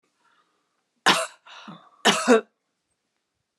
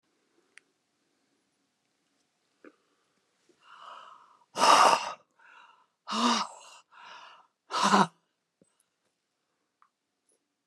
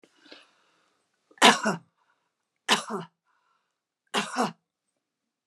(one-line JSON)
{"cough_length": "3.6 s", "cough_amplitude": 22241, "cough_signal_mean_std_ratio": 0.3, "exhalation_length": "10.7 s", "exhalation_amplitude": 16623, "exhalation_signal_mean_std_ratio": 0.26, "three_cough_length": "5.5 s", "three_cough_amplitude": 25234, "three_cough_signal_mean_std_ratio": 0.26, "survey_phase": "beta (2021-08-13 to 2022-03-07)", "age": "65+", "gender": "Female", "wearing_mask": "No", "symptom_none": true, "smoker_status": "Ex-smoker", "respiratory_condition_asthma": false, "respiratory_condition_other": false, "recruitment_source": "REACT", "submission_delay": "1 day", "covid_test_result": "Negative", "covid_test_method": "RT-qPCR"}